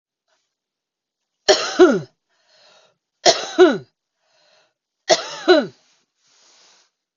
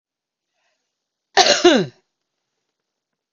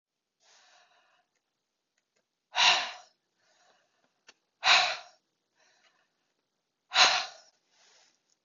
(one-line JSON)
{"three_cough_length": "7.2 s", "three_cough_amplitude": 32767, "three_cough_signal_mean_std_ratio": 0.29, "cough_length": "3.3 s", "cough_amplitude": 32767, "cough_signal_mean_std_ratio": 0.28, "exhalation_length": "8.4 s", "exhalation_amplitude": 13543, "exhalation_signal_mean_std_ratio": 0.26, "survey_phase": "beta (2021-08-13 to 2022-03-07)", "age": "45-64", "gender": "Female", "wearing_mask": "No", "symptom_cough_any": true, "smoker_status": "Current smoker (11 or more cigarettes per day)", "respiratory_condition_asthma": false, "respiratory_condition_other": false, "recruitment_source": "REACT", "submission_delay": "0 days", "covid_test_result": "Negative", "covid_test_method": "RT-qPCR", "influenza_a_test_result": "Negative", "influenza_b_test_result": "Negative"}